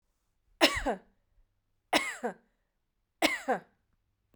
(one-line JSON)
{"three_cough_length": "4.4 s", "three_cough_amplitude": 13427, "three_cough_signal_mean_std_ratio": 0.32, "survey_phase": "beta (2021-08-13 to 2022-03-07)", "age": "18-44", "gender": "Female", "wearing_mask": "No", "symptom_none": true, "smoker_status": "Ex-smoker", "respiratory_condition_asthma": false, "respiratory_condition_other": false, "recruitment_source": "REACT", "submission_delay": "6 days", "covid_test_result": "Negative", "covid_test_method": "RT-qPCR"}